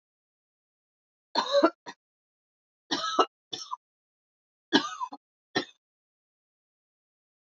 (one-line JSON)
{"three_cough_length": "7.5 s", "three_cough_amplitude": 15812, "three_cough_signal_mean_std_ratio": 0.26, "survey_phase": "beta (2021-08-13 to 2022-03-07)", "age": "18-44", "gender": "Female", "wearing_mask": "No", "symptom_cough_any": true, "symptom_runny_or_blocked_nose": true, "symptom_fatigue": true, "symptom_headache": true, "symptom_other": true, "smoker_status": "Never smoked", "respiratory_condition_asthma": false, "respiratory_condition_other": false, "recruitment_source": "Test and Trace", "submission_delay": "1 day", "covid_test_result": "Positive", "covid_test_method": "RT-qPCR", "covid_ct_value": 20.5, "covid_ct_gene": "ORF1ab gene"}